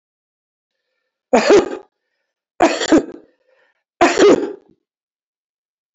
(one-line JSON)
{"three_cough_length": "5.9 s", "three_cough_amplitude": 29933, "three_cough_signal_mean_std_ratio": 0.35, "survey_phase": "alpha (2021-03-01 to 2021-08-12)", "age": "65+", "gender": "Male", "wearing_mask": "No", "symptom_none": true, "smoker_status": "Ex-smoker", "respiratory_condition_asthma": false, "respiratory_condition_other": false, "recruitment_source": "REACT", "submission_delay": "1 day", "covid_test_result": "Negative", "covid_test_method": "RT-qPCR"}